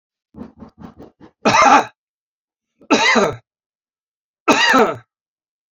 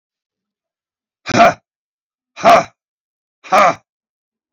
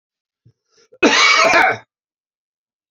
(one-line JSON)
{"three_cough_length": "5.7 s", "three_cough_amplitude": 28910, "three_cough_signal_mean_std_ratio": 0.39, "exhalation_length": "4.5 s", "exhalation_amplitude": 28403, "exhalation_signal_mean_std_ratio": 0.3, "cough_length": "2.9 s", "cough_amplitude": 31835, "cough_signal_mean_std_ratio": 0.43, "survey_phase": "beta (2021-08-13 to 2022-03-07)", "age": "65+", "gender": "Male", "wearing_mask": "No", "symptom_none": true, "smoker_status": "Ex-smoker", "respiratory_condition_asthma": false, "respiratory_condition_other": false, "recruitment_source": "REACT", "submission_delay": "5 days", "covid_test_result": "Negative", "covid_test_method": "RT-qPCR", "influenza_a_test_result": "Negative", "influenza_b_test_result": "Negative"}